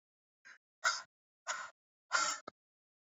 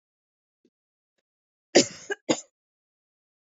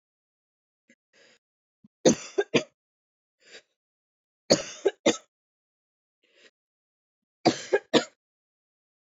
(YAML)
exhalation_length: 3.1 s
exhalation_amplitude: 4227
exhalation_signal_mean_std_ratio: 0.33
cough_length: 3.5 s
cough_amplitude: 24474
cough_signal_mean_std_ratio: 0.17
three_cough_length: 9.1 s
three_cough_amplitude: 19627
three_cough_signal_mean_std_ratio: 0.22
survey_phase: beta (2021-08-13 to 2022-03-07)
age: 18-44
gender: Female
wearing_mask: 'No'
symptom_none: true
smoker_status: Never smoked
respiratory_condition_asthma: false
respiratory_condition_other: false
recruitment_source: REACT
submission_delay: 1 day
covid_test_result: Negative
covid_test_method: RT-qPCR